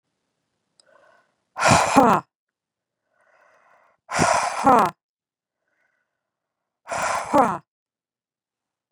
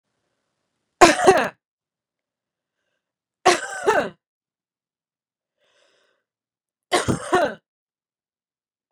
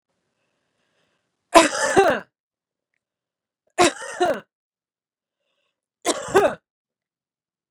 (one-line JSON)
{"exhalation_length": "8.9 s", "exhalation_amplitude": 27547, "exhalation_signal_mean_std_ratio": 0.33, "cough_length": "8.9 s", "cough_amplitude": 32768, "cough_signal_mean_std_ratio": 0.26, "three_cough_length": "7.7 s", "three_cough_amplitude": 32767, "three_cough_signal_mean_std_ratio": 0.29, "survey_phase": "beta (2021-08-13 to 2022-03-07)", "age": "45-64", "gender": "Female", "wearing_mask": "No", "symptom_none": true, "smoker_status": "Current smoker (1 to 10 cigarettes per day)", "respiratory_condition_asthma": false, "respiratory_condition_other": false, "recruitment_source": "REACT", "submission_delay": "5 days", "covid_test_result": "Negative", "covid_test_method": "RT-qPCR", "influenza_a_test_result": "Negative", "influenza_b_test_result": "Negative"}